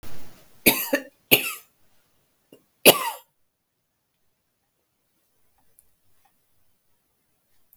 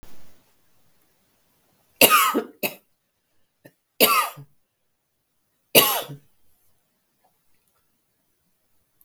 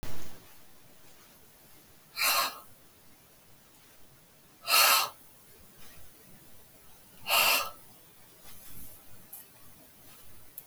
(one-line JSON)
{"cough_length": "7.8 s", "cough_amplitude": 32768, "cough_signal_mean_std_ratio": 0.23, "three_cough_length": "9.0 s", "three_cough_amplitude": 32768, "three_cough_signal_mean_std_ratio": 0.27, "exhalation_length": "10.7 s", "exhalation_amplitude": 11105, "exhalation_signal_mean_std_ratio": 0.4, "survey_phase": "beta (2021-08-13 to 2022-03-07)", "age": "45-64", "gender": "Female", "wearing_mask": "No", "symptom_cough_any": true, "symptom_runny_or_blocked_nose": true, "symptom_sore_throat": true, "symptom_fatigue": true, "symptom_onset": "5 days", "smoker_status": "Never smoked", "respiratory_condition_asthma": true, "respiratory_condition_other": false, "recruitment_source": "Test and Trace", "submission_delay": "2 days", "covid_test_result": "Positive", "covid_test_method": "RT-qPCR", "covid_ct_value": 14.6, "covid_ct_gene": "ORF1ab gene", "covid_ct_mean": 14.8, "covid_viral_load": "14000000 copies/ml", "covid_viral_load_category": "High viral load (>1M copies/ml)"}